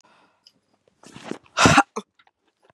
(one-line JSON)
{"exhalation_length": "2.7 s", "exhalation_amplitude": 31384, "exhalation_signal_mean_std_ratio": 0.26, "survey_phase": "beta (2021-08-13 to 2022-03-07)", "age": "45-64", "gender": "Female", "wearing_mask": "No", "symptom_none": true, "smoker_status": "Never smoked", "respiratory_condition_asthma": false, "respiratory_condition_other": false, "recruitment_source": "REACT", "submission_delay": "4 days", "covid_test_result": "Negative", "covid_test_method": "RT-qPCR", "influenza_a_test_result": "Unknown/Void", "influenza_b_test_result": "Unknown/Void"}